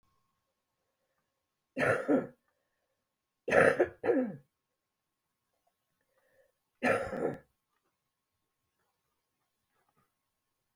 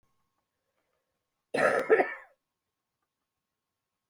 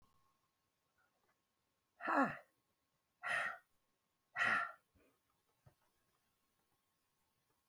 {"three_cough_length": "10.8 s", "three_cough_amplitude": 9597, "three_cough_signal_mean_std_ratio": 0.28, "cough_length": "4.1 s", "cough_amplitude": 9480, "cough_signal_mean_std_ratio": 0.27, "exhalation_length": "7.7 s", "exhalation_amplitude": 2568, "exhalation_signal_mean_std_ratio": 0.28, "survey_phase": "beta (2021-08-13 to 2022-03-07)", "age": "65+", "gender": "Female", "wearing_mask": "No", "symptom_none": true, "smoker_status": "Never smoked", "respiratory_condition_asthma": false, "respiratory_condition_other": false, "recruitment_source": "REACT", "submission_delay": "2 days", "covid_test_result": "Negative", "covid_test_method": "RT-qPCR", "influenza_a_test_result": "Unknown/Void", "influenza_b_test_result": "Unknown/Void"}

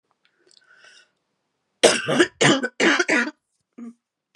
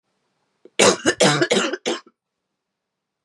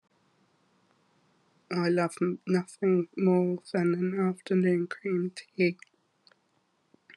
{"cough_length": "4.4 s", "cough_amplitude": 31296, "cough_signal_mean_std_ratio": 0.39, "three_cough_length": "3.2 s", "three_cough_amplitude": 27764, "three_cough_signal_mean_std_ratio": 0.4, "exhalation_length": "7.2 s", "exhalation_amplitude": 6616, "exhalation_signal_mean_std_ratio": 0.53, "survey_phase": "beta (2021-08-13 to 2022-03-07)", "age": "45-64", "gender": "Female", "wearing_mask": "No", "symptom_cough_any": true, "symptom_new_continuous_cough": true, "symptom_runny_or_blocked_nose": true, "symptom_sore_throat": true, "symptom_fatigue": true, "symptom_fever_high_temperature": true, "symptom_headache": true, "symptom_loss_of_taste": true, "symptom_onset": "2 days", "smoker_status": "Ex-smoker", "respiratory_condition_asthma": false, "respiratory_condition_other": false, "recruitment_source": "Test and Trace", "submission_delay": "1 day", "covid_test_result": "Positive", "covid_test_method": "RT-qPCR", "covid_ct_value": 19.5, "covid_ct_gene": "ORF1ab gene"}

